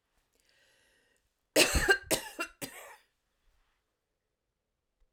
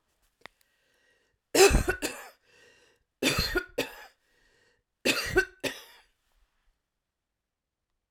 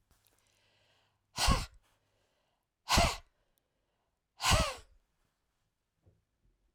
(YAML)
cough_length: 5.1 s
cough_amplitude: 13223
cough_signal_mean_std_ratio: 0.26
three_cough_length: 8.1 s
three_cough_amplitude: 17317
three_cough_signal_mean_std_ratio: 0.3
exhalation_length: 6.7 s
exhalation_amplitude: 6331
exhalation_signal_mean_std_ratio: 0.28
survey_phase: alpha (2021-03-01 to 2021-08-12)
age: 45-64
gender: Female
wearing_mask: 'No'
symptom_none: true
smoker_status: Ex-smoker
respiratory_condition_asthma: false
respiratory_condition_other: false
recruitment_source: REACT
submission_delay: 1 day
covid_test_result: Negative
covid_test_method: RT-qPCR